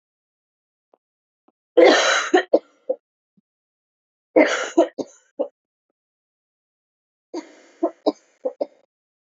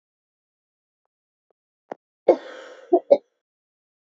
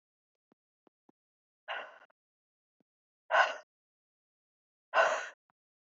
{"three_cough_length": "9.3 s", "three_cough_amplitude": 29735, "three_cough_signal_mean_std_ratio": 0.29, "cough_length": "4.2 s", "cough_amplitude": 27905, "cough_signal_mean_std_ratio": 0.18, "exhalation_length": "5.9 s", "exhalation_amplitude": 8362, "exhalation_signal_mean_std_ratio": 0.24, "survey_phase": "beta (2021-08-13 to 2022-03-07)", "age": "18-44", "gender": "Female", "wearing_mask": "No", "symptom_cough_any": true, "symptom_runny_or_blocked_nose": true, "symptom_shortness_of_breath": true, "symptom_sore_throat": true, "symptom_diarrhoea": true, "symptom_fatigue": true, "symptom_headache": true, "symptom_change_to_sense_of_smell_or_taste": true, "smoker_status": "Never smoked", "respiratory_condition_asthma": false, "respiratory_condition_other": false, "recruitment_source": "Test and Trace", "submission_delay": "2 days", "covid_test_result": "Positive", "covid_test_method": "RT-qPCR", "covid_ct_value": 18.3, "covid_ct_gene": "ORF1ab gene", "covid_ct_mean": 19.2, "covid_viral_load": "520000 copies/ml", "covid_viral_load_category": "Low viral load (10K-1M copies/ml)"}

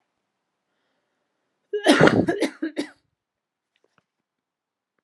{"cough_length": "5.0 s", "cough_amplitude": 31657, "cough_signal_mean_std_ratio": 0.28, "survey_phase": "alpha (2021-03-01 to 2021-08-12)", "age": "18-44", "gender": "Female", "wearing_mask": "No", "symptom_cough_any": true, "symptom_shortness_of_breath": true, "symptom_diarrhoea": true, "symptom_fatigue": true, "symptom_fever_high_temperature": true, "symptom_headache": true, "symptom_change_to_sense_of_smell_or_taste": true, "symptom_onset": "3 days", "smoker_status": "Ex-smoker", "respiratory_condition_asthma": false, "respiratory_condition_other": false, "recruitment_source": "Test and Trace", "submission_delay": "2 days", "covid_test_result": "Positive", "covid_test_method": "ePCR"}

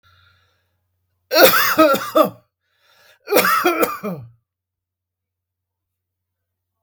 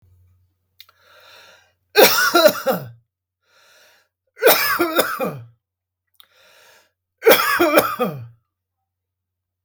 {"cough_length": "6.8 s", "cough_amplitude": 32766, "cough_signal_mean_std_ratio": 0.37, "three_cough_length": "9.6 s", "three_cough_amplitude": 32768, "three_cough_signal_mean_std_ratio": 0.38, "survey_phase": "beta (2021-08-13 to 2022-03-07)", "age": "65+", "gender": "Male", "wearing_mask": "No", "symptom_none": true, "smoker_status": "Ex-smoker", "respiratory_condition_asthma": false, "respiratory_condition_other": false, "recruitment_source": "REACT", "submission_delay": "4 days", "covid_test_result": "Negative", "covid_test_method": "RT-qPCR", "influenza_a_test_result": "Unknown/Void", "influenza_b_test_result": "Unknown/Void"}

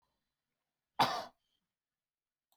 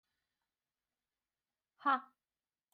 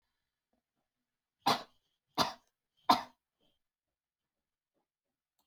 {"cough_length": "2.6 s", "cough_amplitude": 4935, "cough_signal_mean_std_ratio": 0.21, "exhalation_length": "2.7 s", "exhalation_amplitude": 3136, "exhalation_signal_mean_std_ratio": 0.18, "three_cough_length": "5.5 s", "three_cough_amplitude": 8701, "three_cough_signal_mean_std_ratio": 0.18, "survey_phase": "beta (2021-08-13 to 2022-03-07)", "age": "18-44", "gender": "Female", "wearing_mask": "No", "symptom_none": true, "smoker_status": "Never smoked", "respiratory_condition_asthma": false, "respiratory_condition_other": false, "recruitment_source": "REACT", "submission_delay": "0 days", "covid_test_result": "Negative", "covid_test_method": "RT-qPCR"}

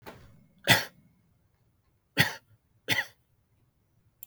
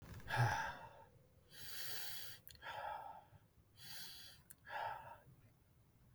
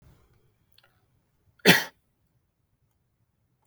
{"three_cough_length": "4.3 s", "three_cough_amplitude": 17700, "three_cough_signal_mean_std_ratio": 0.25, "exhalation_length": "6.1 s", "exhalation_amplitude": 2110, "exhalation_signal_mean_std_ratio": 0.55, "cough_length": "3.7 s", "cough_amplitude": 32584, "cough_signal_mean_std_ratio": 0.16, "survey_phase": "beta (2021-08-13 to 2022-03-07)", "age": "45-64", "gender": "Male", "wearing_mask": "Yes", "symptom_none": true, "smoker_status": "Never smoked", "respiratory_condition_asthma": false, "respiratory_condition_other": false, "recruitment_source": "REACT", "submission_delay": "1 day", "covid_test_result": "Negative", "covid_test_method": "RT-qPCR", "influenza_a_test_result": "Negative", "influenza_b_test_result": "Negative"}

